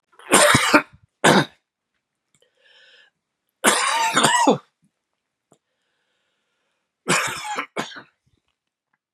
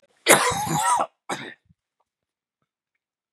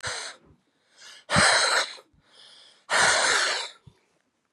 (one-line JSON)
{"three_cough_length": "9.1 s", "three_cough_amplitude": 32767, "three_cough_signal_mean_std_ratio": 0.37, "cough_length": "3.3 s", "cough_amplitude": 32768, "cough_signal_mean_std_ratio": 0.38, "exhalation_length": "4.5 s", "exhalation_amplitude": 18235, "exhalation_signal_mean_std_ratio": 0.5, "survey_phase": "beta (2021-08-13 to 2022-03-07)", "age": "45-64", "gender": "Male", "wearing_mask": "No", "symptom_cough_any": true, "symptom_runny_or_blocked_nose": true, "symptom_diarrhoea": true, "symptom_fatigue": true, "symptom_headache": true, "symptom_change_to_sense_of_smell_or_taste": true, "smoker_status": "Never smoked", "respiratory_condition_asthma": false, "respiratory_condition_other": false, "recruitment_source": "Test and Trace", "submission_delay": "1 day", "covid_test_result": "Positive", "covid_test_method": "RT-qPCR", "covid_ct_value": 14.9, "covid_ct_gene": "ORF1ab gene", "covid_ct_mean": 15.2, "covid_viral_load": "10000000 copies/ml", "covid_viral_load_category": "High viral load (>1M copies/ml)"}